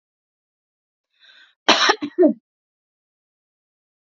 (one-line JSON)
{"cough_length": "4.0 s", "cough_amplitude": 32768, "cough_signal_mean_std_ratio": 0.26, "survey_phase": "alpha (2021-03-01 to 2021-08-12)", "age": "18-44", "gender": "Female", "wearing_mask": "No", "symptom_fatigue": true, "symptom_onset": "12 days", "smoker_status": "Never smoked", "respiratory_condition_asthma": false, "respiratory_condition_other": false, "recruitment_source": "REACT", "submission_delay": "1 day", "covid_test_result": "Negative", "covid_test_method": "RT-qPCR"}